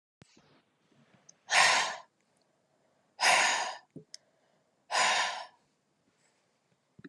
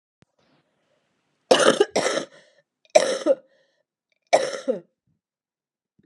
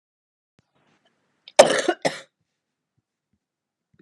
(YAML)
exhalation_length: 7.1 s
exhalation_amplitude: 9779
exhalation_signal_mean_std_ratio: 0.36
three_cough_length: 6.1 s
three_cough_amplitude: 29598
three_cough_signal_mean_std_ratio: 0.31
cough_length: 4.0 s
cough_amplitude: 32768
cough_signal_mean_std_ratio: 0.19
survey_phase: beta (2021-08-13 to 2022-03-07)
age: 45-64
gender: Female
wearing_mask: 'No'
symptom_cough_any: true
symptom_runny_or_blocked_nose: true
symptom_headache: true
symptom_other: true
smoker_status: Never smoked
respiratory_condition_asthma: false
respiratory_condition_other: false
recruitment_source: Test and Trace
submission_delay: 2 days
covid_test_result: Positive
covid_test_method: ePCR